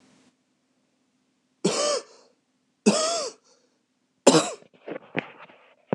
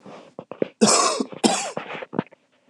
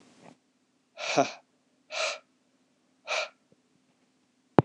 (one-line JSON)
{"three_cough_length": "5.9 s", "three_cough_amplitude": 26027, "three_cough_signal_mean_std_ratio": 0.32, "cough_length": "2.7 s", "cough_amplitude": 25964, "cough_signal_mean_std_ratio": 0.46, "exhalation_length": "4.6 s", "exhalation_amplitude": 26028, "exhalation_signal_mean_std_ratio": 0.24, "survey_phase": "beta (2021-08-13 to 2022-03-07)", "age": "18-44", "gender": "Male", "wearing_mask": "No", "symptom_cough_any": true, "symptom_runny_or_blocked_nose": true, "symptom_sore_throat": true, "symptom_fatigue": true, "symptom_fever_high_temperature": true, "symptom_headache": true, "symptom_onset": "2 days", "smoker_status": "Never smoked", "respiratory_condition_asthma": false, "respiratory_condition_other": false, "recruitment_source": "Test and Trace", "submission_delay": "1 day", "covid_test_result": "Positive", "covid_test_method": "RT-qPCR", "covid_ct_value": 22.6, "covid_ct_gene": "N gene"}